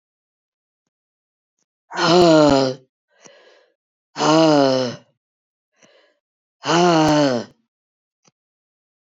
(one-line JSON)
{"exhalation_length": "9.1 s", "exhalation_amplitude": 26984, "exhalation_signal_mean_std_ratio": 0.4, "survey_phase": "beta (2021-08-13 to 2022-03-07)", "age": "65+", "gender": "Female", "wearing_mask": "No", "symptom_cough_any": true, "symptom_runny_or_blocked_nose": true, "symptom_sore_throat": true, "symptom_fatigue": true, "symptom_headache": true, "symptom_other": true, "smoker_status": "Never smoked", "respiratory_condition_asthma": false, "respiratory_condition_other": false, "recruitment_source": "Test and Trace", "submission_delay": "2 days", "covid_test_result": "Positive", "covid_test_method": "ePCR"}